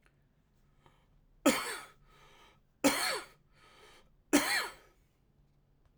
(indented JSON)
{
  "three_cough_length": "6.0 s",
  "three_cough_amplitude": 7850,
  "three_cough_signal_mean_std_ratio": 0.32,
  "survey_phase": "alpha (2021-03-01 to 2021-08-12)",
  "age": "18-44",
  "gender": "Male",
  "wearing_mask": "No",
  "symptom_cough_any": true,
  "symptom_change_to_sense_of_smell_or_taste": true,
  "smoker_status": "Never smoked",
  "respiratory_condition_asthma": false,
  "respiratory_condition_other": false,
  "recruitment_source": "Test and Trace",
  "submission_delay": "2 days",
  "covid_test_result": "Positive",
  "covid_test_method": "RT-qPCR",
  "covid_ct_value": 22.6,
  "covid_ct_gene": "ORF1ab gene"
}